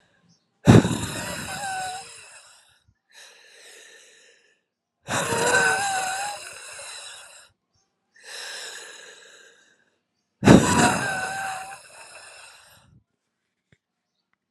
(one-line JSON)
{"exhalation_length": "14.5 s", "exhalation_amplitude": 32768, "exhalation_signal_mean_std_ratio": 0.34, "survey_phase": "alpha (2021-03-01 to 2021-08-12)", "age": "45-64", "gender": "Female", "wearing_mask": "No", "symptom_cough_any": true, "symptom_shortness_of_breath": true, "symptom_fatigue": true, "symptom_change_to_sense_of_smell_or_taste": true, "symptom_onset": "4 days", "smoker_status": "Ex-smoker", "respiratory_condition_asthma": false, "respiratory_condition_other": false, "recruitment_source": "Test and Trace", "submission_delay": "2 days", "covid_test_result": "Positive", "covid_test_method": "RT-qPCR"}